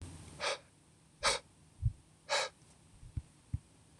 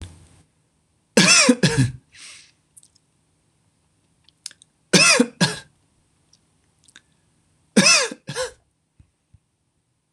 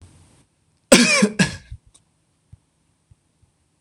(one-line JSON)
{"exhalation_length": "4.0 s", "exhalation_amplitude": 4180, "exhalation_signal_mean_std_ratio": 0.39, "three_cough_length": "10.1 s", "three_cough_amplitude": 26027, "three_cough_signal_mean_std_ratio": 0.31, "cough_length": "3.8 s", "cough_amplitude": 26028, "cough_signal_mean_std_ratio": 0.28, "survey_phase": "beta (2021-08-13 to 2022-03-07)", "age": "18-44", "gender": "Male", "wearing_mask": "No", "symptom_none": true, "smoker_status": "Never smoked", "respiratory_condition_asthma": false, "respiratory_condition_other": false, "recruitment_source": "REACT", "submission_delay": "6 days", "covid_test_result": "Negative", "covid_test_method": "RT-qPCR", "influenza_a_test_result": "Negative", "influenza_b_test_result": "Negative"}